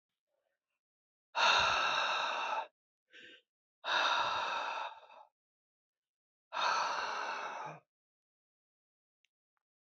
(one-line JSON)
{"exhalation_length": "9.8 s", "exhalation_amplitude": 5072, "exhalation_signal_mean_std_ratio": 0.49, "survey_phase": "beta (2021-08-13 to 2022-03-07)", "age": "45-64", "gender": "Female", "wearing_mask": "No", "symptom_cough_any": true, "symptom_runny_or_blocked_nose": true, "symptom_sore_throat": true, "symptom_headache": true, "symptom_change_to_sense_of_smell_or_taste": true, "symptom_loss_of_taste": true, "smoker_status": "Never smoked", "respiratory_condition_asthma": false, "respiratory_condition_other": false, "recruitment_source": "Test and Trace", "submission_delay": "1 day", "covid_test_result": "Positive", "covid_test_method": "RT-qPCR", "covid_ct_value": 16.5, "covid_ct_gene": "ORF1ab gene", "covid_ct_mean": 16.7, "covid_viral_load": "3200000 copies/ml", "covid_viral_load_category": "High viral load (>1M copies/ml)"}